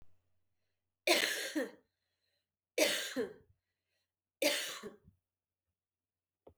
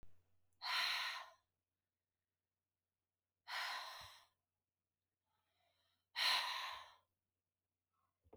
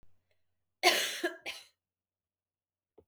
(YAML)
three_cough_length: 6.6 s
three_cough_amplitude: 6085
three_cough_signal_mean_std_ratio: 0.35
exhalation_length: 8.4 s
exhalation_amplitude: 1900
exhalation_signal_mean_std_ratio: 0.37
cough_length: 3.1 s
cough_amplitude: 10380
cough_signal_mean_std_ratio: 0.29
survey_phase: beta (2021-08-13 to 2022-03-07)
age: 18-44
gender: Female
wearing_mask: 'No'
symptom_runny_or_blocked_nose: true
symptom_abdominal_pain: true
symptom_fatigue: true
symptom_fever_high_temperature: true
symptom_headache: true
symptom_change_to_sense_of_smell_or_taste: true
symptom_loss_of_taste: true
symptom_onset: 3 days
smoker_status: Never smoked
respiratory_condition_asthma: false
respiratory_condition_other: false
recruitment_source: Test and Trace
submission_delay: 2 days
covid_test_result: Positive
covid_test_method: RT-qPCR
covid_ct_value: 27.9
covid_ct_gene: ORF1ab gene
covid_ct_mean: 28.4
covid_viral_load: 470 copies/ml
covid_viral_load_category: Minimal viral load (< 10K copies/ml)